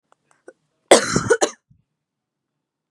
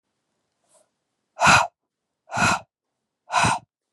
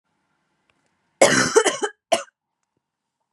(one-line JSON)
{"cough_length": "2.9 s", "cough_amplitude": 32768, "cough_signal_mean_std_ratio": 0.26, "exhalation_length": "3.9 s", "exhalation_amplitude": 26617, "exhalation_signal_mean_std_ratio": 0.34, "three_cough_length": "3.3 s", "three_cough_amplitude": 31356, "three_cough_signal_mean_std_ratio": 0.32, "survey_phase": "beta (2021-08-13 to 2022-03-07)", "age": "18-44", "gender": "Female", "wearing_mask": "No", "symptom_none": true, "smoker_status": "Current smoker (e-cigarettes or vapes only)", "respiratory_condition_asthma": false, "respiratory_condition_other": false, "recruitment_source": "REACT", "submission_delay": "1 day", "covid_test_result": "Negative", "covid_test_method": "RT-qPCR", "influenza_a_test_result": "Negative", "influenza_b_test_result": "Negative"}